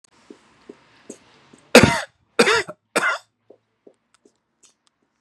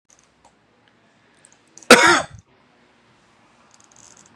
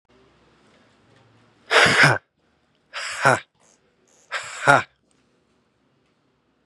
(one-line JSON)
{"three_cough_length": "5.2 s", "three_cough_amplitude": 32768, "three_cough_signal_mean_std_ratio": 0.26, "cough_length": "4.4 s", "cough_amplitude": 32768, "cough_signal_mean_std_ratio": 0.21, "exhalation_length": "6.7 s", "exhalation_amplitude": 32767, "exhalation_signal_mean_std_ratio": 0.3, "survey_phase": "beta (2021-08-13 to 2022-03-07)", "age": "18-44", "gender": "Male", "wearing_mask": "No", "symptom_none": true, "smoker_status": "Ex-smoker", "respiratory_condition_asthma": false, "respiratory_condition_other": false, "recruitment_source": "REACT", "submission_delay": "1 day", "covid_test_result": "Negative", "covid_test_method": "RT-qPCR", "influenza_a_test_result": "Negative", "influenza_b_test_result": "Negative"}